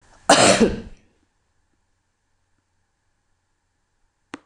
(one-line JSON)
{"cough_length": "4.5 s", "cough_amplitude": 26028, "cough_signal_mean_std_ratio": 0.25, "survey_phase": "beta (2021-08-13 to 2022-03-07)", "age": "65+", "gender": "Female", "wearing_mask": "No", "symptom_cough_any": true, "symptom_fatigue": true, "symptom_other": true, "symptom_onset": "4 days", "smoker_status": "Ex-smoker", "respiratory_condition_asthma": false, "respiratory_condition_other": false, "recruitment_source": "Test and Trace", "submission_delay": "1 day", "covid_test_result": "Positive", "covid_test_method": "ePCR"}